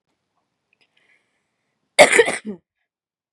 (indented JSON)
{
  "cough_length": "3.3 s",
  "cough_amplitude": 32768,
  "cough_signal_mean_std_ratio": 0.23,
  "survey_phase": "beta (2021-08-13 to 2022-03-07)",
  "age": "18-44",
  "gender": "Female",
  "wearing_mask": "No",
  "symptom_none": true,
  "smoker_status": "Never smoked",
  "respiratory_condition_asthma": true,
  "respiratory_condition_other": false,
  "recruitment_source": "REACT",
  "submission_delay": "2 days",
  "covid_test_result": "Negative",
  "covid_test_method": "RT-qPCR",
  "influenza_a_test_result": "Negative",
  "influenza_b_test_result": "Negative"
}